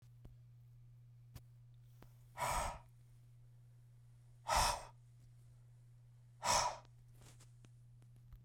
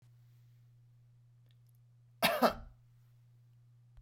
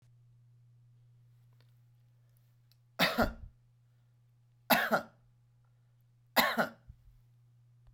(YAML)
exhalation_length: 8.4 s
exhalation_amplitude: 2963
exhalation_signal_mean_std_ratio: 0.4
cough_length: 4.0 s
cough_amplitude: 6749
cough_signal_mean_std_ratio: 0.27
three_cough_length: 7.9 s
three_cough_amplitude: 9097
three_cough_signal_mean_std_ratio: 0.29
survey_phase: beta (2021-08-13 to 2022-03-07)
age: 45-64
gender: Male
wearing_mask: 'No'
symptom_none: true
smoker_status: Ex-smoker
respiratory_condition_asthma: false
respiratory_condition_other: false
recruitment_source: REACT
submission_delay: 1 day
covid_test_result: Negative
covid_test_method: RT-qPCR